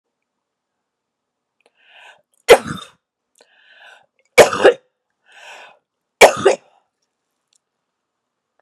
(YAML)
three_cough_length: 8.6 s
three_cough_amplitude: 32768
three_cough_signal_mean_std_ratio: 0.21
survey_phase: beta (2021-08-13 to 2022-03-07)
age: 65+
gender: Female
wearing_mask: 'No'
symptom_cough_any: true
symptom_sore_throat: true
symptom_change_to_sense_of_smell_or_taste: true
symptom_onset: 7 days
smoker_status: Never smoked
respiratory_condition_asthma: false
respiratory_condition_other: false
recruitment_source: Test and Trace
submission_delay: 2 days
covid_test_result: Positive
covid_test_method: RT-qPCR
covid_ct_value: 17.8
covid_ct_gene: N gene
covid_ct_mean: 17.9
covid_viral_load: 1300000 copies/ml
covid_viral_load_category: High viral load (>1M copies/ml)